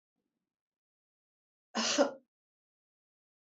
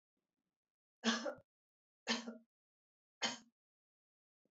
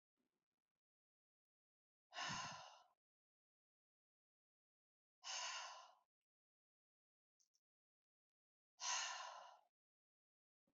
{
  "cough_length": "3.4 s",
  "cough_amplitude": 6087,
  "cough_signal_mean_std_ratio": 0.24,
  "three_cough_length": "4.5 s",
  "three_cough_amplitude": 2514,
  "three_cough_signal_mean_std_ratio": 0.28,
  "exhalation_length": "10.8 s",
  "exhalation_amplitude": 827,
  "exhalation_signal_mean_std_ratio": 0.31,
  "survey_phase": "beta (2021-08-13 to 2022-03-07)",
  "age": "65+",
  "gender": "Female",
  "wearing_mask": "No",
  "symptom_none": true,
  "smoker_status": "Never smoked",
  "respiratory_condition_asthma": false,
  "respiratory_condition_other": false,
  "recruitment_source": "REACT",
  "submission_delay": "2 days",
  "covid_test_result": "Negative",
  "covid_test_method": "RT-qPCR",
  "influenza_a_test_result": "Negative",
  "influenza_b_test_result": "Negative"
}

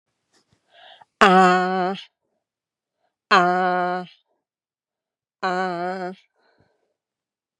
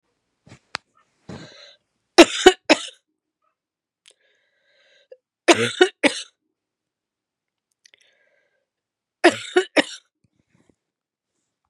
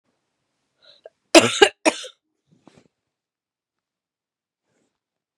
{
  "exhalation_length": "7.6 s",
  "exhalation_amplitude": 32767,
  "exhalation_signal_mean_std_ratio": 0.36,
  "three_cough_length": "11.7 s",
  "three_cough_amplitude": 32768,
  "three_cough_signal_mean_std_ratio": 0.2,
  "cough_length": "5.4 s",
  "cough_amplitude": 32768,
  "cough_signal_mean_std_ratio": 0.17,
  "survey_phase": "beta (2021-08-13 to 2022-03-07)",
  "age": "45-64",
  "gender": "Female",
  "wearing_mask": "No",
  "symptom_runny_or_blocked_nose": true,
  "symptom_fatigue": true,
  "symptom_headache": true,
  "symptom_onset": "2 days",
  "smoker_status": "Never smoked",
  "respiratory_condition_asthma": false,
  "respiratory_condition_other": false,
  "recruitment_source": "Test and Trace",
  "submission_delay": "1 day",
  "covid_test_result": "Positive",
  "covid_test_method": "ePCR"
}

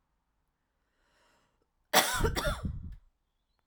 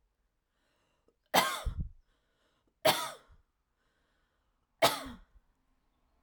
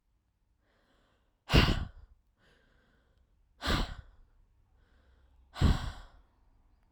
{
  "cough_length": "3.7 s",
  "cough_amplitude": 11045,
  "cough_signal_mean_std_ratio": 0.36,
  "three_cough_length": "6.2 s",
  "three_cough_amplitude": 10099,
  "three_cough_signal_mean_std_ratio": 0.27,
  "exhalation_length": "6.9 s",
  "exhalation_amplitude": 10734,
  "exhalation_signal_mean_std_ratio": 0.28,
  "survey_phase": "beta (2021-08-13 to 2022-03-07)",
  "age": "18-44",
  "gender": "Female",
  "wearing_mask": "No",
  "symptom_none": true,
  "smoker_status": "Ex-smoker",
  "respiratory_condition_asthma": false,
  "respiratory_condition_other": false,
  "recruitment_source": "REACT",
  "submission_delay": "4 days",
  "covid_test_result": "Negative",
  "covid_test_method": "RT-qPCR",
  "influenza_a_test_result": "Negative",
  "influenza_b_test_result": "Negative"
}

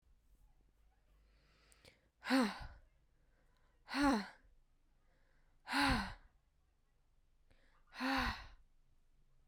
{
  "exhalation_length": "9.5 s",
  "exhalation_amplitude": 2713,
  "exhalation_signal_mean_std_ratio": 0.34,
  "survey_phase": "beta (2021-08-13 to 2022-03-07)",
  "age": "18-44",
  "gender": "Female",
  "wearing_mask": "No",
  "symptom_none": true,
  "smoker_status": "Never smoked",
  "respiratory_condition_asthma": false,
  "respiratory_condition_other": false,
  "recruitment_source": "REACT",
  "submission_delay": "3 days",
  "covid_test_result": "Negative",
  "covid_test_method": "RT-qPCR",
  "influenza_a_test_result": "Negative",
  "influenza_b_test_result": "Negative"
}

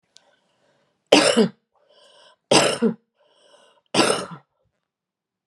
{
  "three_cough_length": "5.5 s",
  "three_cough_amplitude": 32768,
  "three_cough_signal_mean_std_ratio": 0.33,
  "survey_phase": "beta (2021-08-13 to 2022-03-07)",
  "age": "45-64",
  "gender": "Female",
  "wearing_mask": "No",
  "symptom_none": true,
  "smoker_status": "Never smoked",
  "respiratory_condition_asthma": true,
  "respiratory_condition_other": false,
  "recruitment_source": "REACT",
  "submission_delay": "4 days",
  "covid_test_result": "Negative",
  "covid_test_method": "RT-qPCR"
}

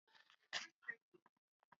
{
  "cough_length": "1.8 s",
  "cough_amplitude": 1043,
  "cough_signal_mean_std_ratio": 0.27,
  "survey_phase": "beta (2021-08-13 to 2022-03-07)",
  "age": "65+",
  "gender": "Female",
  "wearing_mask": "No",
  "symptom_cough_any": true,
  "symptom_shortness_of_breath": true,
  "symptom_fatigue": true,
  "symptom_fever_high_temperature": true,
  "symptom_loss_of_taste": true,
  "symptom_onset": "5 days",
  "smoker_status": "Ex-smoker",
  "respiratory_condition_asthma": true,
  "respiratory_condition_other": false,
  "recruitment_source": "Test and Trace",
  "submission_delay": "1 day",
  "covid_test_result": "Positive",
  "covid_test_method": "RT-qPCR"
}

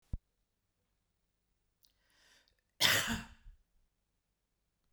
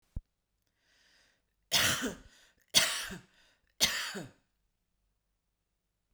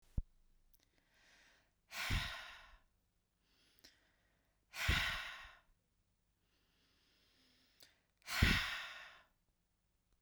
{
  "cough_length": "4.9 s",
  "cough_amplitude": 9676,
  "cough_signal_mean_std_ratio": 0.23,
  "three_cough_length": "6.1 s",
  "three_cough_amplitude": 13411,
  "three_cough_signal_mean_std_ratio": 0.32,
  "exhalation_length": "10.2 s",
  "exhalation_amplitude": 5255,
  "exhalation_signal_mean_std_ratio": 0.31,
  "survey_phase": "beta (2021-08-13 to 2022-03-07)",
  "age": "45-64",
  "gender": "Female",
  "wearing_mask": "No",
  "symptom_none": true,
  "smoker_status": "Never smoked",
  "respiratory_condition_asthma": false,
  "respiratory_condition_other": false,
  "recruitment_source": "Test and Trace",
  "submission_delay": "0 days",
  "covid_test_result": "Negative",
  "covid_test_method": "LFT"
}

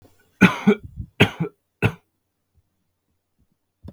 {
  "three_cough_length": "3.9 s",
  "three_cough_amplitude": 32768,
  "three_cough_signal_mean_std_ratio": 0.26,
  "survey_phase": "beta (2021-08-13 to 2022-03-07)",
  "age": "18-44",
  "gender": "Male",
  "wearing_mask": "No",
  "symptom_cough_any": true,
  "symptom_runny_or_blocked_nose": true,
  "symptom_sore_throat": true,
  "symptom_change_to_sense_of_smell_or_taste": true,
  "symptom_other": true,
  "symptom_onset": "5 days",
  "smoker_status": "Never smoked",
  "respiratory_condition_asthma": false,
  "respiratory_condition_other": false,
  "recruitment_source": "Test and Trace",
  "submission_delay": "2 days",
  "covid_test_result": "Positive",
  "covid_test_method": "RT-qPCR",
  "covid_ct_value": 19.5,
  "covid_ct_gene": "N gene"
}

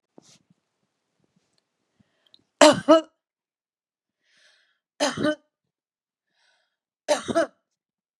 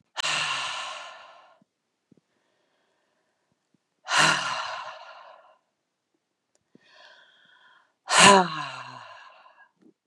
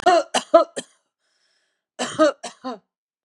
{
  "three_cough_length": "8.2 s",
  "three_cough_amplitude": 31674,
  "three_cough_signal_mean_std_ratio": 0.22,
  "exhalation_length": "10.1 s",
  "exhalation_amplitude": 30793,
  "exhalation_signal_mean_std_ratio": 0.3,
  "cough_length": "3.2 s",
  "cough_amplitude": 31289,
  "cough_signal_mean_std_ratio": 0.35,
  "survey_phase": "beta (2021-08-13 to 2022-03-07)",
  "age": "45-64",
  "gender": "Female",
  "wearing_mask": "No",
  "symptom_none": true,
  "smoker_status": "Current smoker (1 to 10 cigarettes per day)",
  "respiratory_condition_asthma": false,
  "respiratory_condition_other": false,
  "recruitment_source": "REACT",
  "submission_delay": "4 days",
  "covid_test_result": "Negative",
  "covid_test_method": "RT-qPCR",
  "influenza_a_test_result": "Negative",
  "influenza_b_test_result": "Negative"
}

